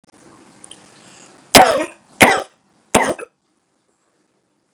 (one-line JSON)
{"three_cough_length": "4.7 s", "three_cough_amplitude": 32768, "three_cough_signal_mean_std_ratio": 0.28, "survey_phase": "beta (2021-08-13 to 2022-03-07)", "age": "45-64", "gender": "Male", "wearing_mask": "No", "symptom_cough_any": true, "symptom_sore_throat": true, "symptom_onset": "3 days", "smoker_status": "Ex-smoker", "respiratory_condition_asthma": false, "respiratory_condition_other": false, "recruitment_source": "Test and Trace", "submission_delay": "2 days", "covid_test_result": "Positive", "covid_test_method": "RT-qPCR", "covid_ct_value": 28.4, "covid_ct_gene": "N gene", "covid_ct_mean": 28.6, "covid_viral_load": "430 copies/ml", "covid_viral_load_category": "Minimal viral load (< 10K copies/ml)"}